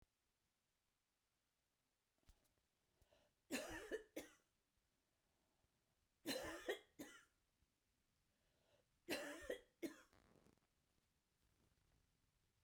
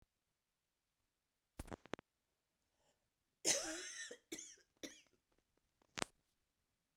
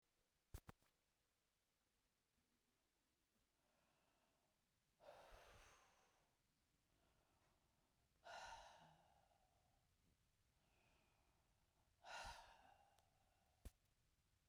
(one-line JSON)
{"three_cough_length": "12.6 s", "three_cough_amplitude": 760, "three_cough_signal_mean_std_ratio": 0.31, "cough_length": "7.0 s", "cough_amplitude": 7019, "cough_signal_mean_std_ratio": 0.24, "exhalation_length": "14.5 s", "exhalation_amplitude": 266, "exhalation_signal_mean_std_ratio": 0.39, "survey_phase": "beta (2021-08-13 to 2022-03-07)", "age": "65+", "gender": "Female", "wearing_mask": "No", "symptom_cough_any": true, "symptom_runny_or_blocked_nose": true, "symptom_shortness_of_breath": true, "symptom_sore_throat": true, "symptom_fatigue": true, "symptom_headache": true, "symptom_loss_of_taste": true, "smoker_status": "Ex-smoker", "respiratory_condition_asthma": false, "respiratory_condition_other": false, "recruitment_source": "REACT", "submission_delay": "2 days", "covid_test_result": "Negative", "covid_test_method": "RT-qPCR", "influenza_a_test_result": "Negative", "influenza_b_test_result": "Negative"}